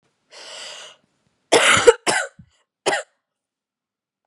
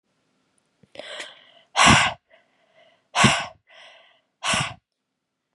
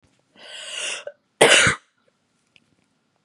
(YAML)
three_cough_length: 4.3 s
three_cough_amplitude: 32768
three_cough_signal_mean_std_ratio: 0.31
exhalation_length: 5.5 s
exhalation_amplitude: 28961
exhalation_signal_mean_std_ratio: 0.32
cough_length: 3.2 s
cough_amplitude: 32766
cough_signal_mean_std_ratio: 0.31
survey_phase: beta (2021-08-13 to 2022-03-07)
age: 18-44
gender: Female
wearing_mask: 'No'
symptom_runny_or_blocked_nose: true
symptom_sore_throat: true
symptom_fatigue: true
symptom_headache: true
symptom_onset: 3 days
smoker_status: Never smoked
respiratory_condition_asthma: false
respiratory_condition_other: false
recruitment_source: Test and Trace
submission_delay: 1 day
covid_test_result: Positive
covid_test_method: RT-qPCR
covid_ct_value: 27.3
covid_ct_gene: ORF1ab gene
covid_ct_mean: 27.8
covid_viral_load: 760 copies/ml
covid_viral_load_category: Minimal viral load (< 10K copies/ml)